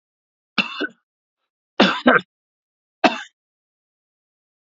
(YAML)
three_cough_length: 4.6 s
three_cough_amplitude: 28569
three_cough_signal_mean_std_ratio: 0.26
survey_phase: alpha (2021-03-01 to 2021-08-12)
age: 65+
gender: Male
wearing_mask: 'No'
symptom_fever_high_temperature: true
smoker_status: Never smoked
respiratory_condition_asthma: false
respiratory_condition_other: false
recruitment_source: Test and Trace
submission_delay: 2 days
covid_test_result: Positive
covid_test_method: RT-qPCR